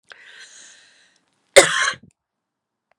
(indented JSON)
{
  "cough_length": "3.0 s",
  "cough_amplitude": 32768,
  "cough_signal_mean_std_ratio": 0.23,
  "survey_phase": "beta (2021-08-13 to 2022-03-07)",
  "age": "18-44",
  "gender": "Female",
  "wearing_mask": "No",
  "symptom_cough_any": true,
  "symptom_runny_or_blocked_nose": true,
  "symptom_fatigue": true,
  "symptom_headache": true,
  "symptom_other": true,
  "symptom_onset": "3 days",
  "smoker_status": "Prefer not to say",
  "respiratory_condition_asthma": false,
  "respiratory_condition_other": false,
  "recruitment_source": "Test and Trace",
  "submission_delay": "2 days",
  "covid_test_result": "Positive",
  "covid_test_method": "RT-qPCR"
}